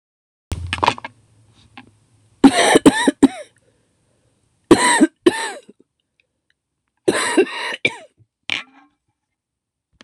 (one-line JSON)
{"three_cough_length": "10.0 s", "three_cough_amplitude": 26028, "three_cough_signal_mean_std_ratio": 0.32, "survey_phase": "beta (2021-08-13 to 2022-03-07)", "age": "45-64", "gender": "Female", "wearing_mask": "No", "symptom_cough_any": true, "symptom_runny_or_blocked_nose": true, "symptom_fatigue": true, "symptom_change_to_sense_of_smell_or_taste": true, "symptom_loss_of_taste": true, "symptom_onset": "3 days", "smoker_status": "Never smoked", "respiratory_condition_asthma": false, "respiratory_condition_other": false, "recruitment_source": "Test and Trace", "submission_delay": "2 days", "covid_test_result": "Positive", "covid_test_method": "RT-qPCR", "covid_ct_value": 16.8, "covid_ct_gene": "ORF1ab gene", "covid_ct_mean": 17.9, "covid_viral_load": "1300000 copies/ml", "covid_viral_load_category": "High viral load (>1M copies/ml)"}